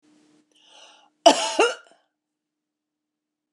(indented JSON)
{
  "cough_length": "3.5 s",
  "cough_amplitude": 28611,
  "cough_signal_mean_std_ratio": 0.23,
  "survey_phase": "beta (2021-08-13 to 2022-03-07)",
  "age": "65+",
  "gender": "Female",
  "wearing_mask": "No",
  "symptom_none": true,
  "smoker_status": "Ex-smoker",
  "respiratory_condition_asthma": false,
  "respiratory_condition_other": false,
  "recruitment_source": "REACT",
  "submission_delay": "1 day",
  "covid_test_result": "Negative",
  "covid_test_method": "RT-qPCR",
  "influenza_a_test_result": "Unknown/Void",
  "influenza_b_test_result": "Unknown/Void"
}